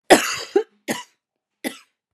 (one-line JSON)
{"three_cough_length": "2.1 s", "three_cough_amplitude": 32768, "three_cough_signal_mean_std_ratio": 0.3, "survey_phase": "beta (2021-08-13 to 2022-03-07)", "age": "18-44", "gender": "Female", "wearing_mask": "No", "symptom_cough_any": true, "symptom_new_continuous_cough": true, "symptom_runny_or_blocked_nose": true, "symptom_shortness_of_breath": true, "symptom_sore_throat": true, "symptom_fatigue": true, "symptom_fever_high_temperature": true, "symptom_headache": true, "symptom_change_to_sense_of_smell_or_taste": true, "symptom_loss_of_taste": true, "symptom_onset": "5 days", "smoker_status": "Never smoked", "respiratory_condition_asthma": false, "respiratory_condition_other": false, "recruitment_source": "Test and Trace", "submission_delay": "2 days", "covid_test_result": "Positive", "covid_test_method": "RT-qPCR", "covid_ct_value": 23.1, "covid_ct_gene": "ORF1ab gene"}